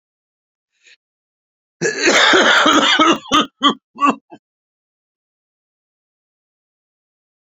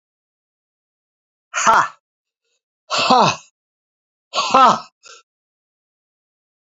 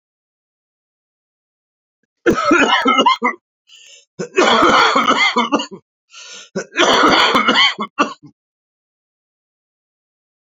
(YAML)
cough_length: 7.6 s
cough_amplitude: 32767
cough_signal_mean_std_ratio: 0.39
exhalation_length: 6.7 s
exhalation_amplitude: 31398
exhalation_signal_mean_std_ratio: 0.31
three_cough_length: 10.5 s
three_cough_amplitude: 32562
three_cough_signal_mean_std_ratio: 0.48
survey_phase: beta (2021-08-13 to 2022-03-07)
age: 65+
gender: Male
wearing_mask: 'No'
symptom_cough_any: true
symptom_runny_or_blocked_nose: true
symptom_shortness_of_breath: true
symptom_sore_throat: true
symptom_diarrhoea: true
symptom_fatigue: true
symptom_fever_high_temperature: true
symptom_headache: true
symptom_change_to_sense_of_smell_or_taste: true
symptom_other: true
symptom_onset: 3 days
smoker_status: Never smoked
respiratory_condition_asthma: false
respiratory_condition_other: false
recruitment_source: Test and Trace
submission_delay: 1 day
covid_test_result: Positive
covid_test_method: ePCR